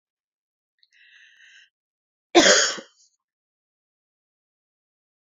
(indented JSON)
{
  "cough_length": "5.2 s",
  "cough_amplitude": 29607,
  "cough_signal_mean_std_ratio": 0.21,
  "survey_phase": "beta (2021-08-13 to 2022-03-07)",
  "age": "18-44",
  "gender": "Female",
  "wearing_mask": "No",
  "symptom_cough_any": true,
  "symptom_runny_or_blocked_nose": true,
  "symptom_sore_throat": true,
  "smoker_status": "Never smoked",
  "respiratory_condition_asthma": false,
  "respiratory_condition_other": false,
  "recruitment_source": "Test and Trace",
  "submission_delay": "2 days",
  "covid_test_result": "Positive",
  "covid_test_method": "RT-qPCR",
  "covid_ct_value": 29.9,
  "covid_ct_gene": "ORF1ab gene"
}